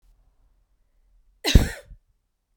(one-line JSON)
{"cough_length": "2.6 s", "cough_amplitude": 30603, "cough_signal_mean_std_ratio": 0.2, "survey_phase": "beta (2021-08-13 to 2022-03-07)", "age": "18-44", "gender": "Female", "wearing_mask": "No", "symptom_other": true, "symptom_onset": "7 days", "smoker_status": "Ex-smoker", "respiratory_condition_asthma": true, "respiratory_condition_other": false, "recruitment_source": "REACT", "submission_delay": "1 day", "covid_test_result": "Negative", "covid_test_method": "RT-qPCR", "influenza_a_test_result": "Unknown/Void", "influenza_b_test_result": "Unknown/Void"}